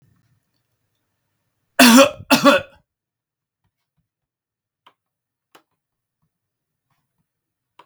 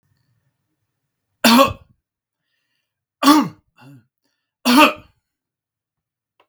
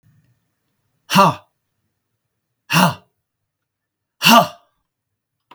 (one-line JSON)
{"cough_length": "7.9 s", "cough_amplitude": 32768, "cough_signal_mean_std_ratio": 0.21, "three_cough_length": "6.5 s", "three_cough_amplitude": 32768, "three_cough_signal_mean_std_ratio": 0.28, "exhalation_length": "5.5 s", "exhalation_amplitude": 32766, "exhalation_signal_mean_std_ratio": 0.27, "survey_phase": "beta (2021-08-13 to 2022-03-07)", "age": "65+", "gender": "Male", "wearing_mask": "No", "symptom_none": true, "smoker_status": "Ex-smoker", "respiratory_condition_asthma": false, "respiratory_condition_other": false, "recruitment_source": "REACT", "submission_delay": "2 days", "covid_test_result": "Negative", "covid_test_method": "RT-qPCR", "influenza_a_test_result": "Negative", "influenza_b_test_result": "Negative"}